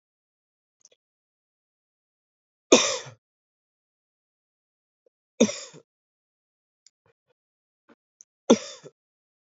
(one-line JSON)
{"three_cough_length": "9.6 s", "three_cough_amplitude": 27256, "three_cough_signal_mean_std_ratio": 0.15, "survey_phase": "alpha (2021-03-01 to 2021-08-12)", "age": "18-44", "gender": "Male", "wearing_mask": "No", "symptom_cough_any": true, "symptom_fatigue": true, "symptom_fever_high_temperature": true, "symptom_headache": true, "symptom_change_to_sense_of_smell_or_taste": true, "symptom_loss_of_taste": true, "symptom_onset": "3 days", "smoker_status": "Current smoker (e-cigarettes or vapes only)", "respiratory_condition_asthma": false, "respiratory_condition_other": false, "recruitment_source": "Test and Trace", "submission_delay": "2 days", "covid_test_result": "Positive", "covid_test_method": "RT-qPCR", "covid_ct_value": 11.9, "covid_ct_gene": "ORF1ab gene", "covid_ct_mean": 12.3, "covid_viral_load": "96000000 copies/ml", "covid_viral_load_category": "High viral load (>1M copies/ml)"}